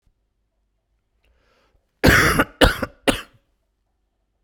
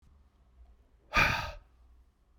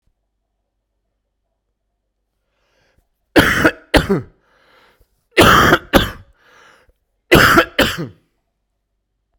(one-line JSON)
{"cough_length": "4.4 s", "cough_amplitude": 32768, "cough_signal_mean_std_ratio": 0.3, "exhalation_length": "2.4 s", "exhalation_amplitude": 8447, "exhalation_signal_mean_std_ratio": 0.32, "three_cough_length": "9.4 s", "three_cough_amplitude": 32768, "three_cough_signal_mean_std_ratio": 0.33, "survey_phase": "beta (2021-08-13 to 2022-03-07)", "age": "45-64", "gender": "Male", "wearing_mask": "No", "symptom_cough_any": true, "symptom_runny_or_blocked_nose": true, "symptom_sore_throat": true, "symptom_abdominal_pain": true, "symptom_fatigue": true, "symptom_fever_high_temperature": true, "symptom_headache": true, "symptom_change_to_sense_of_smell_or_taste": true, "smoker_status": "Never smoked", "respiratory_condition_asthma": false, "respiratory_condition_other": false, "recruitment_source": "Test and Trace", "submission_delay": "1 day", "covid_test_result": "Positive", "covid_test_method": "RT-qPCR", "covid_ct_value": 16.0, "covid_ct_gene": "N gene", "covid_ct_mean": 17.3, "covid_viral_load": "2100000 copies/ml", "covid_viral_load_category": "High viral load (>1M copies/ml)"}